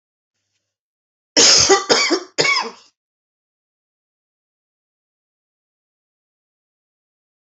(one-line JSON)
{"three_cough_length": "7.4 s", "three_cough_amplitude": 30662, "three_cough_signal_mean_std_ratio": 0.29, "survey_phase": "beta (2021-08-13 to 2022-03-07)", "age": "65+", "gender": "Female", "wearing_mask": "No", "symptom_none": true, "symptom_onset": "8 days", "smoker_status": "Never smoked", "respiratory_condition_asthma": false, "respiratory_condition_other": false, "recruitment_source": "REACT", "submission_delay": "1 day", "covid_test_result": "Negative", "covid_test_method": "RT-qPCR", "influenza_a_test_result": "Negative", "influenza_b_test_result": "Negative"}